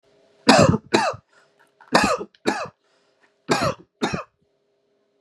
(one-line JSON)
{"three_cough_length": "5.2 s", "three_cough_amplitude": 32548, "three_cough_signal_mean_std_ratio": 0.37, "survey_phase": "beta (2021-08-13 to 2022-03-07)", "age": "45-64", "gender": "Male", "wearing_mask": "No", "symptom_none": true, "smoker_status": "Never smoked", "respiratory_condition_asthma": false, "respiratory_condition_other": false, "recruitment_source": "REACT", "submission_delay": "2 days", "covid_test_result": "Negative", "covid_test_method": "RT-qPCR", "influenza_a_test_result": "Unknown/Void", "influenza_b_test_result": "Unknown/Void"}